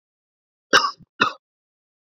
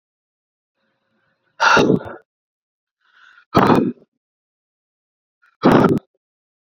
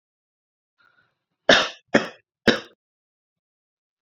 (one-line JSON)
{"cough_length": "2.1 s", "cough_amplitude": 28981, "cough_signal_mean_std_ratio": 0.25, "exhalation_length": "6.7 s", "exhalation_amplitude": 29117, "exhalation_signal_mean_std_ratio": 0.33, "three_cough_length": "4.0 s", "three_cough_amplitude": 28412, "three_cough_signal_mean_std_ratio": 0.22, "survey_phase": "beta (2021-08-13 to 2022-03-07)", "age": "18-44", "gender": "Male", "wearing_mask": "No", "symptom_none": true, "smoker_status": "Never smoked", "respiratory_condition_asthma": false, "respiratory_condition_other": false, "recruitment_source": "REACT", "submission_delay": "1 day", "covid_test_result": "Negative", "covid_test_method": "RT-qPCR"}